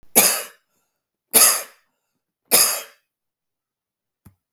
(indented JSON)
{
  "three_cough_length": "4.5 s",
  "three_cough_amplitude": 32768,
  "three_cough_signal_mean_std_ratio": 0.32,
  "survey_phase": "beta (2021-08-13 to 2022-03-07)",
  "age": "45-64",
  "gender": "Male",
  "wearing_mask": "No",
  "symptom_runny_or_blocked_nose": true,
  "symptom_fatigue": true,
  "symptom_change_to_sense_of_smell_or_taste": true,
  "smoker_status": "Ex-smoker",
  "respiratory_condition_asthma": true,
  "respiratory_condition_other": false,
  "recruitment_source": "Test and Trace",
  "submission_delay": "0 days",
  "covid_test_result": "Positive",
  "covid_test_method": "LFT"
}